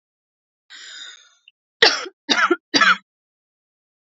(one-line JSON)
{"three_cough_length": "4.1 s", "three_cough_amplitude": 29463, "three_cough_signal_mean_std_ratio": 0.31, "survey_phase": "beta (2021-08-13 to 2022-03-07)", "age": "18-44", "gender": "Female", "wearing_mask": "No", "symptom_fatigue": true, "symptom_headache": true, "symptom_other": true, "smoker_status": "Never smoked", "respiratory_condition_asthma": true, "respiratory_condition_other": false, "recruitment_source": "REACT", "submission_delay": "1 day", "covid_test_result": "Negative", "covid_test_method": "RT-qPCR", "covid_ct_value": 38.0, "covid_ct_gene": "N gene", "influenza_a_test_result": "Negative", "influenza_b_test_result": "Negative"}